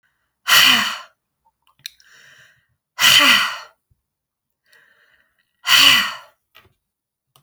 exhalation_length: 7.4 s
exhalation_amplitude: 32768
exhalation_signal_mean_std_ratio: 0.35
survey_phase: beta (2021-08-13 to 2022-03-07)
age: 65+
gender: Female
wearing_mask: 'No'
symptom_none: true
symptom_onset: 11 days
smoker_status: Ex-smoker
respiratory_condition_asthma: false
respiratory_condition_other: false
recruitment_source: REACT
submission_delay: 0 days
covid_test_result: Negative
covid_test_method: RT-qPCR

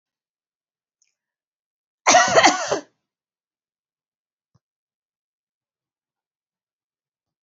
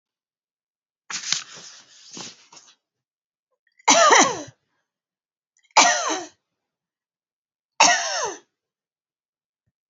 cough_length: 7.4 s
cough_amplitude: 28571
cough_signal_mean_std_ratio: 0.21
three_cough_length: 9.9 s
three_cough_amplitude: 29934
three_cough_signal_mean_std_ratio: 0.3
survey_phase: beta (2021-08-13 to 2022-03-07)
age: 65+
gender: Female
wearing_mask: 'No'
symptom_none: true
symptom_onset: 11 days
smoker_status: Never smoked
respiratory_condition_asthma: false
respiratory_condition_other: false
recruitment_source: REACT
submission_delay: 1 day
covid_test_result: Negative
covid_test_method: RT-qPCR
influenza_a_test_result: Negative
influenza_b_test_result: Negative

